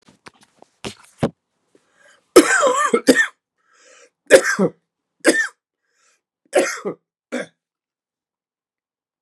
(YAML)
three_cough_length: 9.2 s
three_cough_amplitude: 32768
three_cough_signal_mean_std_ratio: 0.31
survey_phase: beta (2021-08-13 to 2022-03-07)
age: 65+
gender: Male
wearing_mask: 'No'
symptom_runny_or_blocked_nose: true
symptom_change_to_sense_of_smell_or_taste: true
symptom_other: true
smoker_status: Never smoked
respiratory_condition_asthma: false
respiratory_condition_other: false
recruitment_source: Test and Trace
submission_delay: 1 day
covid_test_result: Positive
covid_test_method: RT-qPCR
covid_ct_value: 21.8
covid_ct_gene: ORF1ab gene
covid_ct_mean: 22.4
covid_viral_load: 46000 copies/ml
covid_viral_load_category: Low viral load (10K-1M copies/ml)